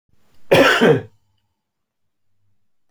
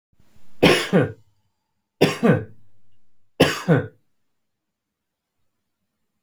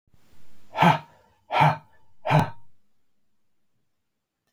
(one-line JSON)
{"cough_length": "2.9 s", "cough_amplitude": 29957, "cough_signal_mean_std_ratio": 0.35, "three_cough_length": "6.2 s", "three_cough_amplitude": 28257, "three_cough_signal_mean_std_ratio": 0.35, "exhalation_length": "4.5 s", "exhalation_amplitude": 21983, "exhalation_signal_mean_std_ratio": 0.36, "survey_phase": "beta (2021-08-13 to 2022-03-07)", "age": "45-64", "gender": "Male", "wearing_mask": "No", "symptom_none": true, "smoker_status": "Never smoked", "respiratory_condition_asthma": false, "respiratory_condition_other": false, "recruitment_source": "REACT", "submission_delay": "2 days", "covid_test_result": "Negative", "covid_test_method": "RT-qPCR"}